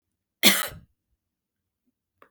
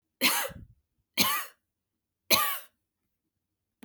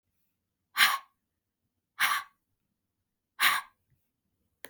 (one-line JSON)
{"cough_length": "2.3 s", "cough_amplitude": 29360, "cough_signal_mean_std_ratio": 0.22, "three_cough_length": "3.8 s", "three_cough_amplitude": 14175, "three_cough_signal_mean_std_ratio": 0.36, "exhalation_length": "4.7 s", "exhalation_amplitude": 13313, "exhalation_signal_mean_std_ratio": 0.28, "survey_phase": "beta (2021-08-13 to 2022-03-07)", "age": "45-64", "gender": "Female", "wearing_mask": "No", "symptom_runny_or_blocked_nose": true, "symptom_fatigue": true, "symptom_headache": true, "smoker_status": "Never smoked", "respiratory_condition_asthma": false, "respiratory_condition_other": true, "recruitment_source": "Test and Trace", "submission_delay": "3 days", "covid_test_result": "Positive", "covid_test_method": "RT-qPCR", "covid_ct_value": 24.8, "covid_ct_gene": "ORF1ab gene", "covid_ct_mean": 25.1, "covid_viral_load": "5900 copies/ml", "covid_viral_load_category": "Minimal viral load (< 10K copies/ml)"}